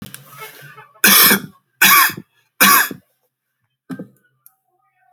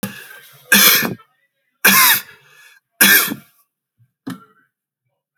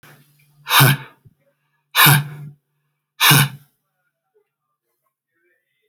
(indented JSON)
{
  "cough_length": "5.1 s",
  "cough_amplitude": 32768,
  "cough_signal_mean_std_ratio": 0.37,
  "three_cough_length": "5.4 s",
  "three_cough_amplitude": 32768,
  "three_cough_signal_mean_std_ratio": 0.38,
  "exhalation_length": "5.9 s",
  "exhalation_amplitude": 32768,
  "exhalation_signal_mean_std_ratio": 0.32,
  "survey_phase": "alpha (2021-03-01 to 2021-08-12)",
  "age": "45-64",
  "gender": "Male",
  "wearing_mask": "No",
  "symptom_none": true,
  "smoker_status": "Ex-smoker",
  "respiratory_condition_asthma": false,
  "respiratory_condition_other": false,
  "recruitment_source": "Test and Trace",
  "submission_delay": "2 days",
  "covid_test_result": "Positive",
  "covid_test_method": "RT-qPCR",
  "covid_ct_value": 22.2,
  "covid_ct_gene": "ORF1ab gene",
  "covid_ct_mean": 22.5,
  "covid_viral_load": "41000 copies/ml",
  "covid_viral_load_category": "Low viral load (10K-1M copies/ml)"
}